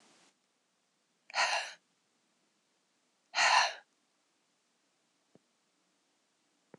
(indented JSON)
{
  "exhalation_length": "6.8 s",
  "exhalation_amplitude": 7635,
  "exhalation_signal_mean_std_ratio": 0.25,
  "survey_phase": "beta (2021-08-13 to 2022-03-07)",
  "age": "45-64",
  "gender": "Female",
  "wearing_mask": "Yes",
  "symptom_cough_any": true,
  "symptom_runny_or_blocked_nose": true,
  "symptom_headache": true,
  "symptom_change_to_sense_of_smell_or_taste": true,
  "symptom_loss_of_taste": true,
  "symptom_onset": "4 days",
  "smoker_status": "Never smoked",
  "respiratory_condition_asthma": false,
  "respiratory_condition_other": false,
  "recruitment_source": "Test and Trace",
  "submission_delay": "1 day",
  "covid_test_result": "Positive",
  "covid_test_method": "RT-qPCR",
  "covid_ct_value": 21.4,
  "covid_ct_gene": "N gene"
}